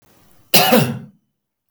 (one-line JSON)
{"cough_length": "1.7 s", "cough_amplitude": 32766, "cough_signal_mean_std_ratio": 0.4, "survey_phase": "beta (2021-08-13 to 2022-03-07)", "age": "65+", "gender": "Male", "wearing_mask": "No", "symptom_none": true, "smoker_status": "Ex-smoker", "respiratory_condition_asthma": false, "respiratory_condition_other": false, "recruitment_source": "REACT", "submission_delay": "4 days", "covid_test_result": "Negative", "covid_test_method": "RT-qPCR", "influenza_a_test_result": "Negative", "influenza_b_test_result": "Negative"}